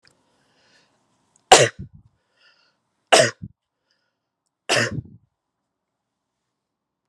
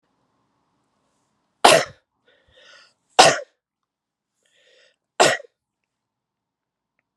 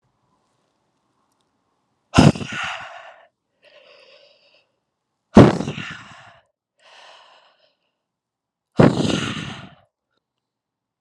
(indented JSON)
{
  "three_cough_length": "7.1 s",
  "three_cough_amplitude": 32768,
  "three_cough_signal_mean_std_ratio": 0.21,
  "cough_length": "7.2 s",
  "cough_amplitude": 32768,
  "cough_signal_mean_std_ratio": 0.2,
  "exhalation_length": "11.0 s",
  "exhalation_amplitude": 32768,
  "exhalation_signal_mean_std_ratio": 0.23,
  "survey_phase": "alpha (2021-03-01 to 2021-08-12)",
  "age": "18-44",
  "gender": "Male",
  "wearing_mask": "No",
  "symptom_diarrhoea": true,
  "symptom_fatigue": true,
  "symptom_change_to_sense_of_smell_or_taste": true,
  "symptom_loss_of_taste": true,
  "symptom_onset": "7 days",
  "smoker_status": "Current smoker (1 to 10 cigarettes per day)",
  "respiratory_condition_asthma": false,
  "respiratory_condition_other": false,
  "recruitment_source": "Test and Trace",
  "submission_delay": "2 days",
  "covid_test_result": "Positive",
  "covid_test_method": "RT-qPCR"
}